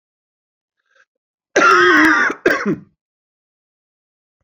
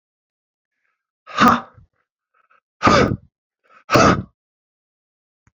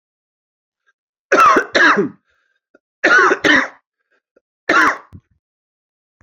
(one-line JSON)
{"cough_length": "4.4 s", "cough_amplitude": 28910, "cough_signal_mean_std_ratio": 0.4, "exhalation_length": "5.5 s", "exhalation_amplitude": 32767, "exhalation_signal_mean_std_ratio": 0.31, "three_cough_length": "6.2 s", "three_cough_amplitude": 32767, "three_cough_signal_mean_std_ratio": 0.41, "survey_phase": "beta (2021-08-13 to 2022-03-07)", "age": "45-64", "gender": "Male", "wearing_mask": "No", "symptom_headache": true, "symptom_change_to_sense_of_smell_or_taste": true, "symptom_loss_of_taste": true, "symptom_onset": "3 days", "smoker_status": "Never smoked", "respiratory_condition_asthma": false, "respiratory_condition_other": false, "recruitment_source": "Test and Trace", "submission_delay": "1 day", "covid_test_result": "Positive", "covid_test_method": "RT-qPCR", "covid_ct_value": 27.2, "covid_ct_gene": "ORF1ab gene", "covid_ct_mean": 27.7, "covid_viral_load": "840 copies/ml", "covid_viral_load_category": "Minimal viral load (< 10K copies/ml)"}